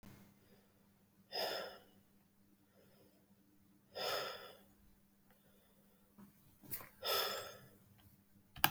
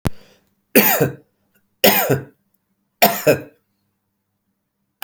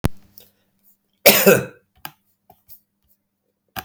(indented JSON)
{
  "exhalation_length": "8.7 s",
  "exhalation_amplitude": 9950,
  "exhalation_signal_mean_std_ratio": 0.35,
  "three_cough_length": "5.0 s",
  "three_cough_amplitude": 32768,
  "three_cough_signal_mean_std_ratio": 0.35,
  "cough_length": "3.8 s",
  "cough_amplitude": 32768,
  "cough_signal_mean_std_ratio": 0.26,
  "survey_phase": "beta (2021-08-13 to 2022-03-07)",
  "age": "18-44",
  "gender": "Male",
  "wearing_mask": "No",
  "symptom_change_to_sense_of_smell_or_taste": true,
  "smoker_status": "Never smoked",
  "respiratory_condition_asthma": false,
  "respiratory_condition_other": false,
  "recruitment_source": "REACT",
  "submission_delay": "1 day",
  "covid_test_result": "Negative",
  "covid_test_method": "RT-qPCR",
  "influenza_a_test_result": "Negative",
  "influenza_b_test_result": "Negative"
}